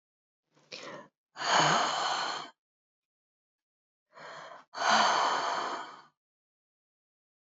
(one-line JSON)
{"exhalation_length": "7.5 s", "exhalation_amplitude": 9080, "exhalation_signal_mean_std_ratio": 0.44, "survey_phase": "beta (2021-08-13 to 2022-03-07)", "age": "45-64", "gender": "Female", "wearing_mask": "Yes", "symptom_cough_any": true, "symptom_runny_or_blocked_nose": true, "symptom_fatigue": true, "symptom_fever_high_temperature": true, "symptom_headache": true, "symptom_change_to_sense_of_smell_or_taste": true, "symptom_onset": "3 days", "smoker_status": "Never smoked", "respiratory_condition_asthma": false, "respiratory_condition_other": false, "recruitment_source": "Test and Trace", "submission_delay": "2 days", "covid_test_result": "Positive", "covid_test_method": "RT-qPCR", "covid_ct_value": 25.2, "covid_ct_gene": "ORF1ab gene", "covid_ct_mean": 25.5, "covid_viral_load": "4400 copies/ml", "covid_viral_load_category": "Minimal viral load (< 10K copies/ml)"}